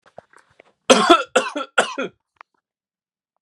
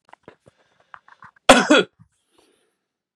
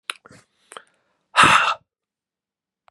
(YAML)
three_cough_length: 3.4 s
three_cough_amplitude: 32768
three_cough_signal_mean_std_ratio: 0.31
cough_length: 3.2 s
cough_amplitude: 32768
cough_signal_mean_std_ratio: 0.24
exhalation_length: 2.9 s
exhalation_amplitude: 30454
exhalation_signal_mean_std_ratio: 0.29
survey_phase: beta (2021-08-13 to 2022-03-07)
age: 45-64
gender: Male
wearing_mask: 'No'
symptom_sore_throat: true
symptom_onset: 3 days
smoker_status: Never smoked
respiratory_condition_asthma: false
respiratory_condition_other: false
recruitment_source: Test and Trace
submission_delay: 1 day
covid_test_result: Positive
covid_test_method: RT-qPCR
covid_ct_value: 21.1
covid_ct_gene: ORF1ab gene
covid_ct_mean: 21.3
covid_viral_load: 110000 copies/ml
covid_viral_load_category: Low viral load (10K-1M copies/ml)